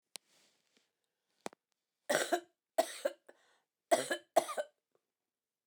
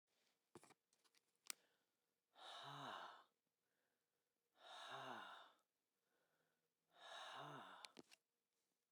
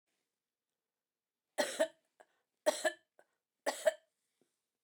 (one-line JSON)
{"cough_length": "5.7 s", "cough_amplitude": 6674, "cough_signal_mean_std_ratio": 0.27, "exhalation_length": "8.9 s", "exhalation_amplitude": 1203, "exhalation_signal_mean_std_ratio": 0.46, "three_cough_length": "4.8 s", "three_cough_amplitude": 4694, "three_cough_signal_mean_std_ratio": 0.25, "survey_phase": "beta (2021-08-13 to 2022-03-07)", "age": "45-64", "gender": "Female", "wearing_mask": "No", "symptom_none": true, "symptom_onset": "10 days", "smoker_status": "Never smoked", "respiratory_condition_asthma": false, "respiratory_condition_other": false, "recruitment_source": "REACT", "submission_delay": "1 day", "covid_test_result": "Negative", "covid_test_method": "RT-qPCR"}